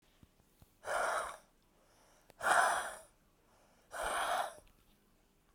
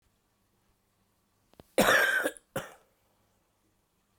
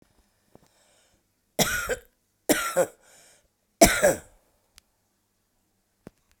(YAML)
exhalation_length: 5.5 s
exhalation_amplitude: 5583
exhalation_signal_mean_std_ratio: 0.43
cough_length: 4.2 s
cough_amplitude: 11384
cough_signal_mean_std_ratio: 0.3
three_cough_length: 6.4 s
three_cough_amplitude: 32768
three_cough_signal_mean_std_ratio: 0.27
survey_phase: beta (2021-08-13 to 2022-03-07)
age: 45-64
gender: Female
wearing_mask: 'No'
symptom_cough_any: true
symptom_runny_or_blocked_nose: true
symptom_shortness_of_breath: true
symptom_sore_throat: true
symptom_fatigue: true
symptom_fever_high_temperature: true
symptom_headache: true
symptom_change_to_sense_of_smell_or_taste: true
symptom_loss_of_taste: true
smoker_status: Current smoker (11 or more cigarettes per day)
respiratory_condition_asthma: false
respiratory_condition_other: false
recruitment_source: Test and Trace
submission_delay: 1 day
covid_test_result: Positive
covid_test_method: RT-qPCR